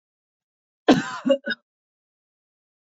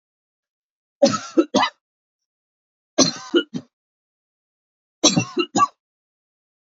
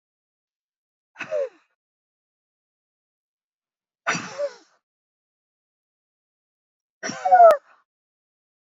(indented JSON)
{
  "cough_length": "2.9 s",
  "cough_amplitude": 26182,
  "cough_signal_mean_std_ratio": 0.26,
  "three_cough_length": "6.7 s",
  "three_cough_amplitude": 32369,
  "three_cough_signal_mean_std_ratio": 0.3,
  "exhalation_length": "8.8 s",
  "exhalation_amplitude": 23312,
  "exhalation_signal_mean_std_ratio": 0.21,
  "survey_phase": "beta (2021-08-13 to 2022-03-07)",
  "age": "45-64",
  "gender": "Female",
  "wearing_mask": "No",
  "symptom_none": true,
  "smoker_status": "Never smoked",
  "respiratory_condition_asthma": true,
  "respiratory_condition_other": false,
  "recruitment_source": "REACT",
  "submission_delay": "1 day",
  "covid_test_result": "Negative",
  "covid_test_method": "RT-qPCR"
}